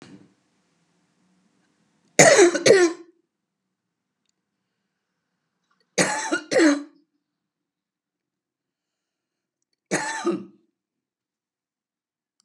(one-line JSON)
{"three_cough_length": "12.4 s", "three_cough_amplitude": 32706, "three_cough_signal_mean_std_ratio": 0.27, "survey_phase": "beta (2021-08-13 to 2022-03-07)", "age": "65+", "gender": "Female", "wearing_mask": "No", "symptom_cough_any": true, "symptom_runny_or_blocked_nose": true, "symptom_sore_throat": true, "symptom_onset": "2 days", "smoker_status": "Never smoked", "respiratory_condition_asthma": false, "respiratory_condition_other": false, "recruitment_source": "Test and Trace", "submission_delay": "1 day", "covid_test_result": "Negative", "covid_test_method": "ePCR"}